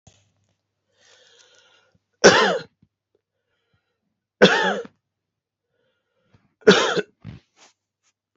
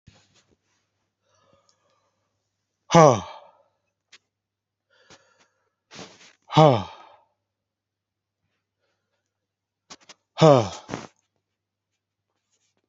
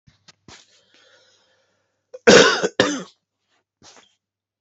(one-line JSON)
{"three_cough_length": "8.4 s", "three_cough_amplitude": 31545, "three_cough_signal_mean_std_ratio": 0.26, "exhalation_length": "12.9 s", "exhalation_amplitude": 29934, "exhalation_signal_mean_std_ratio": 0.18, "cough_length": "4.6 s", "cough_amplitude": 32768, "cough_signal_mean_std_ratio": 0.26, "survey_phase": "beta (2021-08-13 to 2022-03-07)", "age": "45-64", "gender": "Male", "wearing_mask": "No", "symptom_change_to_sense_of_smell_or_taste": true, "smoker_status": "Never smoked", "respiratory_condition_asthma": false, "respiratory_condition_other": false, "recruitment_source": "Test and Trace", "submission_delay": "1 day", "covid_test_result": "Positive", "covid_test_method": "RT-qPCR"}